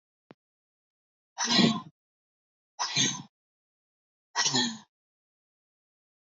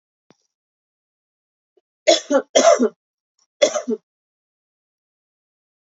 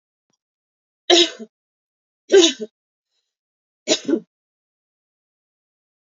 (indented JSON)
{
  "exhalation_length": "6.3 s",
  "exhalation_amplitude": 10668,
  "exhalation_signal_mean_std_ratio": 0.32,
  "cough_length": "5.8 s",
  "cough_amplitude": 29422,
  "cough_signal_mean_std_ratio": 0.28,
  "three_cough_length": "6.1 s",
  "three_cough_amplitude": 29706,
  "three_cough_signal_mean_std_ratio": 0.24,
  "survey_phase": "beta (2021-08-13 to 2022-03-07)",
  "age": "18-44",
  "gender": "Female",
  "wearing_mask": "No",
  "symptom_none": true,
  "smoker_status": "Ex-smoker",
  "respiratory_condition_asthma": false,
  "respiratory_condition_other": false,
  "recruitment_source": "REACT",
  "submission_delay": "2 days",
  "covid_test_result": "Negative",
  "covid_test_method": "RT-qPCR",
  "influenza_a_test_result": "Negative",
  "influenza_b_test_result": "Negative"
}